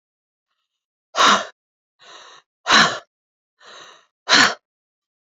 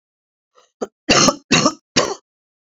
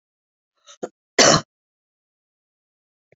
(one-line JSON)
{"exhalation_length": "5.4 s", "exhalation_amplitude": 31551, "exhalation_signal_mean_std_ratio": 0.3, "three_cough_length": "2.6 s", "three_cough_amplitude": 32767, "three_cough_signal_mean_std_ratio": 0.38, "cough_length": "3.2 s", "cough_amplitude": 29561, "cough_signal_mean_std_ratio": 0.21, "survey_phase": "beta (2021-08-13 to 2022-03-07)", "age": "65+", "gender": "Female", "wearing_mask": "No", "symptom_cough_any": true, "symptom_runny_or_blocked_nose": true, "smoker_status": "Never smoked", "respiratory_condition_asthma": false, "respiratory_condition_other": false, "recruitment_source": "Test and Trace", "submission_delay": "2 days", "covid_test_result": "Positive", "covid_test_method": "RT-qPCR", "covid_ct_value": 19.0, "covid_ct_gene": "ORF1ab gene", "covid_ct_mean": 19.2, "covid_viral_load": "520000 copies/ml", "covid_viral_load_category": "Low viral load (10K-1M copies/ml)"}